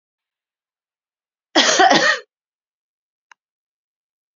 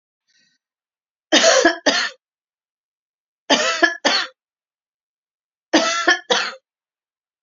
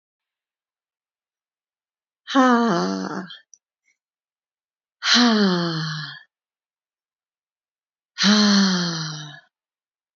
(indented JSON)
{
  "cough_length": "4.4 s",
  "cough_amplitude": 32253,
  "cough_signal_mean_std_ratio": 0.29,
  "three_cough_length": "7.4 s",
  "three_cough_amplitude": 31370,
  "three_cough_signal_mean_std_ratio": 0.39,
  "exhalation_length": "10.2 s",
  "exhalation_amplitude": 21889,
  "exhalation_signal_mean_std_ratio": 0.43,
  "survey_phase": "beta (2021-08-13 to 2022-03-07)",
  "age": "45-64",
  "gender": "Female",
  "wearing_mask": "No",
  "symptom_none": true,
  "smoker_status": "Never smoked",
  "respiratory_condition_asthma": true,
  "respiratory_condition_other": false,
  "recruitment_source": "REACT",
  "submission_delay": "1 day",
  "covid_test_result": "Negative",
  "covid_test_method": "RT-qPCR",
  "influenza_a_test_result": "Unknown/Void",
  "influenza_b_test_result": "Unknown/Void"
}